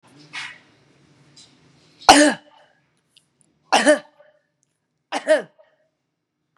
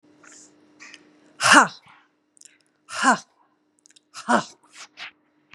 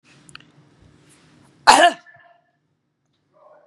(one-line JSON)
{"three_cough_length": "6.6 s", "three_cough_amplitude": 32768, "three_cough_signal_mean_std_ratio": 0.26, "exhalation_length": "5.5 s", "exhalation_amplitude": 32767, "exhalation_signal_mean_std_ratio": 0.26, "cough_length": "3.7 s", "cough_amplitude": 32768, "cough_signal_mean_std_ratio": 0.22, "survey_phase": "beta (2021-08-13 to 2022-03-07)", "age": "65+", "gender": "Female", "wearing_mask": "No", "symptom_none": true, "symptom_onset": "6 days", "smoker_status": "Never smoked", "respiratory_condition_asthma": false, "respiratory_condition_other": false, "recruitment_source": "Test and Trace", "submission_delay": "2 days", "covid_test_result": "Negative", "covid_test_method": "RT-qPCR"}